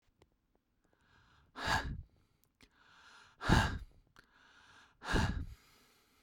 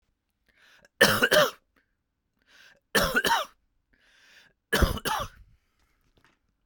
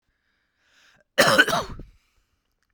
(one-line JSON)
{"exhalation_length": "6.2 s", "exhalation_amplitude": 7738, "exhalation_signal_mean_std_ratio": 0.33, "three_cough_length": "6.7 s", "three_cough_amplitude": 19408, "three_cough_signal_mean_std_ratio": 0.34, "cough_length": "2.7 s", "cough_amplitude": 31306, "cough_signal_mean_std_ratio": 0.31, "survey_phase": "beta (2021-08-13 to 2022-03-07)", "age": "18-44", "gender": "Male", "wearing_mask": "No", "symptom_runny_or_blocked_nose": true, "smoker_status": "Never smoked", "respiratory_condition_asthma": false, "respiratory_condition_other": false, "recruitment_source": "REACT", "submission_delay": "1 day", "covid_test_result": "Negative", "covid_test_method": "RT-qPCR", "influenza_a_test_result": "Negative", "influenza_b_test_result": "Negative"}